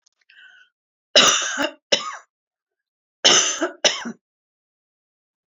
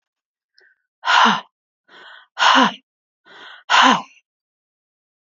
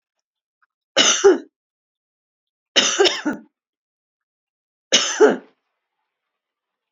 {"cough_length": "5.5 s", "cough_amplitude": 31663, "cough_signal_mean_std_ratio": 0.35, "exhalation_length": "5.2 s", "exhalation_amplitude": 29159, "exhalation_signal_mean_std_ratio": 0.35, "three_cough_length": "6.9 s", "three_cough_amplitude": 31128, "three_cough_signal_mean_std_ratio": 0.32, "survey_phase": "alpha (2021-03-01 to 2021-08-12)", "age": "65+", "gender": "Female", "wearing_mask": "No", "symptom_none": true, "symptom_onset": "9 days", "smoker_status": "Ex-smoker", "respiratory_condition_asthma": false, "respiratory_condition_other": false, "recruitment_source": "REACT", "submission_delay": "2 days", "covid_test_result": "Negative", "covid_test_method": "RT-qPCR"}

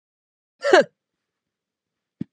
{"cough_length": "2.3 s", "cough_amplitude": 27980, "cough_signal_mean_std_ratio": 0.22, "survey_phase": "beta (2021-08-13 to 2022-03-07)", "age": "45-64", "gender": "Female", "wearing_mask": "No", "symptom_none": true, "smoker_status": "Ex-smoker", "respiratory_condition_asthma": false, "respiratory_condition_other": false, "recruitment_source": "REACT", "submission_delay": "2 days", "covid_test_result": "Negative", "covid_test_method": "RT-qPCR", "influenza_a_test_result": "Unknown/Void", "influenza_b_test_result": "Unknown/Void"}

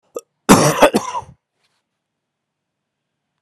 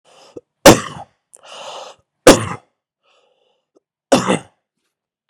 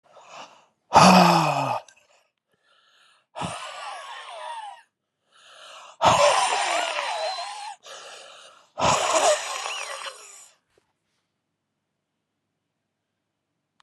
{"cough_length": "3.4 s", "cough_amplitude": 32768, "cough_signal_mean_std_ratio": 0.3, "three_cough_length": "5.3 s", "three_cough_amplitude": 32768, "three_cough_signal_mean_std_ratio": 0.25, "exhalation_length": "13.8 s", "exhalation_amplitude": 26602, "exhalation_signal_mean_std_ratio": 0.39, "survey_phase": "beta (2021-08-13 to 2022-03-07)", "age": "18-44", "gender": "Male", "wearing_mask": "No", "symptom_cough_any": true, "symptom_shortness_of_breath": true, "symptom_abdominal_pain": true, "symptom_fatigue": true, "symptom_fever_high_temperature": true, "symptom_headache": true, "symptom_loss_of_taste": true, "symptom_onset": "9 days", "smoker_status": "Ex-smoker", "respiratory_condition_asthma": false, "respiratory_condition_other": false, "recruitment_source": "Test and Trace", "submission_delay": "2 days", "covid_test_result": "Positive", "covid_test_method": "RT-qPCR"}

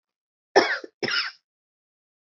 {"cough_length": "2.3 s", "cough_amplitude": 23009, "cough_signal_mean_std_ratio": 0.31, "survey_phase": "alpha (2021-03-01 to 2021-08-12)", "age": "45-64", "gender": "Female", "wearing_mask": "No", "symptom_none": true, "symptom_cough_any": true, "smoker_status": "Never smoked", "respiratory_condition_asthma": false, "respiratory_condition_other": false, "recruitment_source": "REACT", "submission_delay": "1 day", "covid_test_result": "Negative", "covid_test_method": "RT-qPCR"}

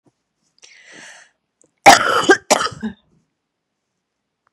{"cough_length": "4.5 s", "cough_amplitude": 32768, "cough_signal_mean_std_ratio": 0.27, "survey_phase": "beta (2021-08-13 to 2022-03-07)", "age": "45-64", "gender": "Female", "wearing_mask": "No", "symptom_runny_or_blocked_nose": true, "symptom_sore_throat": true, "symptom_headache": true, "symptom_onset": "3 days", "smoker_status": "Never smoked", "respiratory_condition_asthma": false, "respiratory_condition_other": false, "recruitment_source": "Test and Trace", "submission_delay": "2 days", "covid_test_result": "Positive", "covid_test_method": "RT-qPCR", "covid_ct_value": 18.8, "covid_ct_gene": "ORF1ab gene", "covid_ct_mean": 19.7, "covid_viral_load": "330000 copies/ml", "covid_viral_load_category": "Low viral load (10K-1M copies/ml)"}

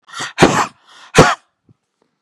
{"exhalation_length": "2.2 s", "exhalation_amplitude": 32768, "exhalation_signal_mean_std_ratio": 0.37, "survey_phase": "beta (2021-08-13 to 2022-03-07)", "age": "65+", "gender": "Female", "wearing_mask": "No", "symptom_none": true, "smoker_status": "Never smoked", "respiratory_condition_asthma": false, "respiratory_condition_other": false, "recruitment_source": "REACT", "submission_delay": "1 day", "covid_test_result": "Negative", "covid_test_method": "RT-qPCR", "influenza_a_test_result": "Negative", "influenza_b_test_result": "Negative"}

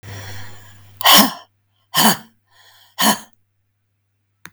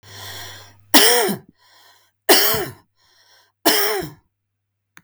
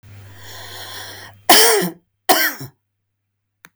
{"exhalation_length": "4.5 s", "exhalation_amplitude": 32768, "exhalation_signal_mean_std_ratio": 0.34, "three_cough_length": "5.0 s", "three_cough_amplitude": 32768, "three_cough_signal_mean_std_ratio": 0.4, "cough_length": "3.8 s", "cough_amplitude": 32768, "cough_signal_mean_std_ratio": 0.38, "survey_phase": "beta (2021-08-13 to 2022-03-07)", "age": "45-64", "gender": "Female", "wearing_mask": "No", "symptom_none": true, "smoker_status": "Ex-smoker", "respiratory_condition_asthma": false, "respiratory_condition_other": false, "recruitment_source": "REACT", "submission_delay": "4 days", "covid_test_result": "Negative", "covid_test_method": "RT-qPCR", "influenza_a_test_result": "Negative", "influenza_b_test_result": "Negative"}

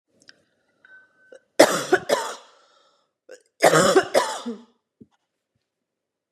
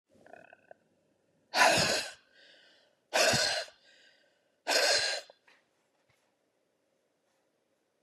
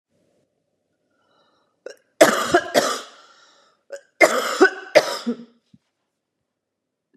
{"cough_length": "6.3 s", "cough_amplitude": 32767, "cough_signal_mean_std_ratio": 0.32, "exhalation_length": "8.0 s", "exhalation_amplitude": 10636, "exhalation_signal_mean_std_ratio": 0.36, "three_cough_length": "7.2 s", "three_cough_amplitude": 32768, "three_cough_signal_mean_std_ratio": 0.31, "survey_phase": "beta (2021-08-13 to 2022-03-07)", "age": "45-64", "gender": "Female", "wearing_mask": "No", "symptom_cough_any": true, "symptom_runny_or_blocked_nose": true, "symptom_shortness_of_breath": true, "symptom_sore_throat": true, "symptom_fatigue": true, "symptom_headache": true, "symptom_change_to_sense_of_smell_or_taste": true, "smoker_status": "Never smoked", "respiratory_condition_asthma": true, "respiratory_condition_other": false, "recruitment_source": "Test and Trace", "submission_delay": "0 days", "covid_test_result": "Positive", "covid_test_method": "LFT"}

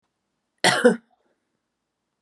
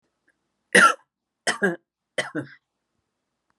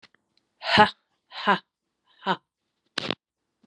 {"cough_length": "2.2 s", "cough_amplitude": 26462, "cough_signal_mean_std_ratio": 0.27, "three_cough_length": "3.6 s", "three_cough_amplitude": 29030, "three_cough_signal_mean_std_ratio": 0.27, "exhalation_length": "3.7 s", "exhalation_amplitude": 29510, "exhalation_signal_mean_std_ratio": 0.26, "survey_phase": "beta (2021-08-13 to 2022-03-07)", "age": "45-64", "gender": "Female", "wearing_mask": "No", "symptom_change_to_sense_of_smell_or_taste": true, "symptom_loss_of_taste": true, "symptom_onset": "3 days", "smoker_status": "Ex-smoker", "respiratory_condition_asthma": false, "respiratory_condition_other": false, "recruitment_source": "Test and Trace", "submission_delay": "2 days", "covid_test_result": "Positive", "covid_test_method": "RT-qPCR"}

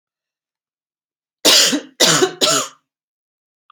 {"three_cough_length": "3.7 s", "three_cough_amplitude": 32768, "three_cough_signal_mean_std_ratio": 0.4, "survey_phase": "beta (2021-08-13 to 2022-03-07)", "age": "18-44", "gender": "Female", "wearing_mask": "No", "symptom_cough_any": true, "symptom_runny_or_blocked_nose": true, "symptom_fatigue": true, "symptom_fever_high_temperature": true, "symptom_headache": true, "smoker_status": "Never smoked", "respiratory_condition_asthma": false, "respiratory_condition_other": false, "recruitment_source": "Test and Trace", "submission_delay": "4 days", "covid_test_result": "Negative", "covid_test_method": "RT-qPCR"}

